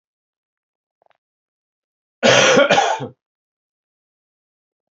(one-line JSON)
{"cough_length": "4.9 s", "cough_amplitude": 29841, "cough_signal_mean_std_ratio": 0.31, "survey_phase": "beta (2021-08-13 to 2022-03-07)", "age": "45-64", "gender": "Male", "wearing_mask": "No", "symptom_cough_any": true, "symptom_runny_or_blocked_nose": true, "symptom_shortness_of_breath": true, "symptom_fatigue": true, "symptom_headache": true, "symptom_change_to_sense_of_smell_or_taste": true, "symptom_loss_of_taste": true, "symptom_other": true, "symptom_onset": "4 days", "smoker_status": "Never smoked", "respiratory_condition_asthma": false, "respiratory_condition_other": false, "recruitment_source": "Test and Trace", "submission_delay": "1 day", "covid_test_result": "Positive", "covid_test_method": "RT-qPCR", "covid_ct_value": 15.1, "covid_ct_gene": "ORF1ab gene", "covid_ct_mean": 15.6, "covid_viral_load": "7400000 copies/ml", "covid_viral_load_category": "High viral load (>1M copies/ml)"}